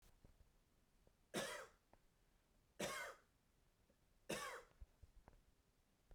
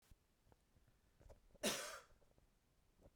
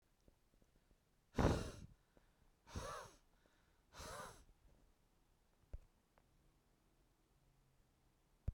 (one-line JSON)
{"three_cough_length": "6.1 s", "three_cough_amplitude": 755, "three_cough_signal_mean_std_ratio": 0.4, "cough_length": "3.2 s", "cough_amplitude": 1330, "cough_signal_mean_std_ratio": 0.32, "exhalation_length": "8.5 s", "exhalation_amplitude": 2574, "exhalation_signal_mean_std_ratio": 0.26, "survey_phase": "beta (2021-08-13 to 2022-03-07)", "age": "45-64", "gender": "Male", "wearing_mask": "No", "symptom_none": true, "symptom_onset": "7 days", "smoker_status": "Current smoker (1 to 10 cigarettes per day)", "respiratory_condition_asthma": false, "respiratory_condition_other": false, "recruitment_source": "REACT", "submission_delay": "1 day", "covid_test_result": "Negative", "covid_test_method": "RT-qPCR"}